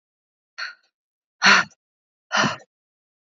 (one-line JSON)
{"exhalation_length": "3.2 s", "exhalation_amplitude": 29047, "exhalation_signal_mean_std_ratio": 0.29, "survey_phase": "beta (2021-08-13 to 2022-03-07)", "age": "18-44", "gender": "Female", "wearing_mask": "No", "symptom_none": true, "smoker_status": "Never smoked", "respiratory_condition_asthma": false, "respiratory_condition_other": false, "recruitment_source": "REACT", "submission_delay": "2 days", "covid_test_result": "Negative", "covid_test_method": "RT-qPCR", "influenza_a_test_result": "Negative", "influenza_b_test_result": "Negative"}